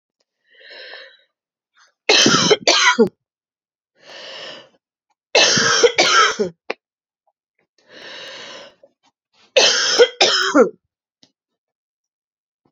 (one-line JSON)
{"three_cough_length": "12.7 s", "three_cough_amplitude": 31992, "three_cough_signal_mean_std_ratio": 0.4, "survey_phase": "alpha (2021-03-01 to 2021-08-12)", "age": "45-64", "gender": "Female", "wearing_mask": "No", "symptom_cough_any": true, "symptom_shortness_of_breath": true, "symptom_abdominal_pain": true, "symptom_fatigue": true, "symptom_fever_high_temperature": true, "symptom_headache": true, "symptom_change_to_sense_of_smell_or_taste": true, "symptom_loss_of_taste": true, "symptom_onset": "5 days", "smoker_status": "Ex-smoker", "respiratory_condition_asthma": false, "respiratory_condition_other": false, "recruitment_source": "Test and Trace", "submission_delay": "2 days", "covid_test_result": "Positive", "covid_test_method": "RT-qPCR", "covid_ct_value": 13.3, "covid_ct_gene": "ORF1ab gene", "covid_ct_mean": 13.9, "covid_viral_load": "28000000 copies/ml", "covid_viral_load_category": "High viral load (>1M copies/ml)"}